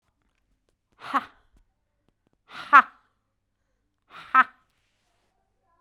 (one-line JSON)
{"exhalation_length": "5.8 s", "exhalation_amplitude": 27091, "exhalation_signal_mean_std_ratio": 0.16, "survey_phase": "beta (2021-08-13 to 2022-03-07)", "age": "45-64", "gender": "Female", "wearing_mask": "No", "symptom_none": true, "smoker_status": "Ex-smoker", "respiratory_condition_asthma": false, "respiratory_condition_other": false, "recruitment_source": "REACT", "submission_delay": "1 day", "covid_test_result": "Negative", "covid_test_method": "RT-qPCR"}